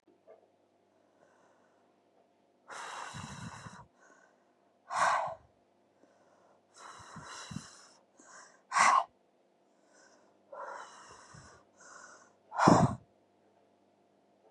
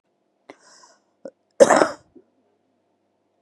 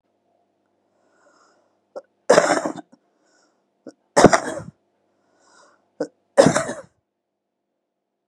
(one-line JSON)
{"exhalation_length": "14.5 s", "exhalation_amplitude": 14772, "exhalation_signal_mean_std_ratio": 0.27, "cough_length": "3.4 s", "cough_amplitude": 32767, "cough_signal_mean_std_ratio": 0.2, "three_cough_length": "8.3 s", "three_cough_amplitude": 32768, "three_cough_signal_mean_std_ratio": 0.24, "survey_phase": "beta (2021-08-13 to 2022-03-07)", "age": "45-64", "gender": "Female", "wearing_mask": "No", "symptom_fatigue": true, "smoker_status": "Current smoker (11 or more cigarettes per day)", "respiratory_condition_asthma": false, "respiratory_condition_other": false, "recruitment_source": "Test and Trace", "submission_delay": "1 day", "covid_test_result": "Negative", "covid_test_method": "RT-qPCR"}